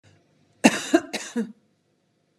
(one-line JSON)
{"cough_length": "2.4 s", "cough_amplitude": 31653, "cough_signal_mean_std_ratio": 0.29, "survey_phase": "beta (2021-08-13 to 2022-03-07)", "age": "45-64", "gender": "Female", "wearing_mask": "No", "symptom_none": true, "smoker_status": "Ex-smoker", "respiratory_condition_asthma": true, "respiratory_condition_other": true, "recruitment_source": "REACT", "submission_delay": "1 day", "covid_test_result": "Negative", "covid_test_method": "RT-qPCR", "influenza_a_test_result": "Negative", "influenza_b_test_result": "Negative"}